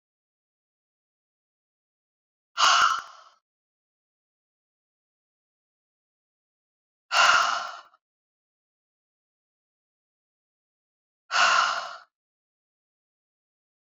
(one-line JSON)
{"exhalation_length": "13.8 s", "exhalation_amplitude": 16845, "exhalation_signal_mean_std_ratio": 0.26, "survey_phase": "beta (2021-08-13 to 2022-03-07)", "age": "45-64", "gender": "Female", "wearing_mask": "No", "symptom_none": true, "smoker_status": "Never smoked", "respiratory_condition_asthma": false, "respiratory_condition_other": false, "recruitment_source": "REACT", "submission_delay": "1 day", "covid_test_result": "Negative", "covid_test_method": "RT-qPCR"}